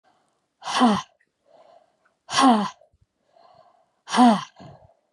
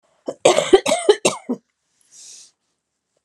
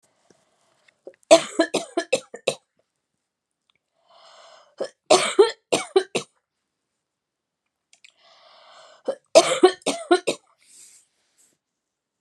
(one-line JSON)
{"exhalation_length": "5.1 s", "exhalation_amplitude": 19456, "exhalation_signal_mean_std_ratio": 0.36, "cough_length": "3.2 s", "cough_amplitude": 32767, "cough_signal_mean_std_ratio": 0.33, "three_cough_length": "12.2 s", "three_cough_amplitude": 32652, "three_cough_signal_mean_std_ratio": 0.26, "survey_phase": "beta (2021-08-13 to 2022-03-07)", "age": "65+", "gender": "Female", "wearing_mask": "No", "symptom_runny_or_blocked_nose": true, "symptom_headache": true, "smoker_status": "Ex-smoker", "respiratory_condition_asthma": false, "respiratory_condition_other": false, "recruitment_source": "Test and Trace", "submission_delay": "2 days", "covid_test_result": "Positive", "covid_test_method": "RT-qPCR", "covid_ct_value": 20.1, "covid_ct_gene": "ORF1ab gene", "covid_ct_mean": 21.1, "covid_viral_load": "120000 copies/ml", "covid_viral_load_category": "Low viral load (10K-1M copies/ml)"}